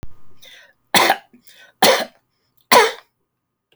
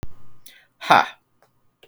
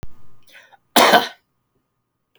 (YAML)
three_cough_length: 3.8 s
three_cough_amplitude: 32768
three_cough_signal_mean_std_ratio: 0.36
exhalation_length: 1.9 s
exhalation_amplitude: 28299
exhalation_signal_mean_std_ratio: 0.34
cough_length: 2.4 s
cough_amplitude: 31508
cough_signal_mean_std_ratio: 0.34
survey_phase: alpha (2021-03-01 to 2021-08-12)
age: 45-64
gender: Male
wearing_mask: 'No'
symptom_none: true
smoker_status: Never smoked
respiratory_condition_asthma: false
respiratory_condition_other: false
recruitment_source: REACT
submission_delay: 1 day
covid_test_result: Negative
covid_test_method: RT-qPCR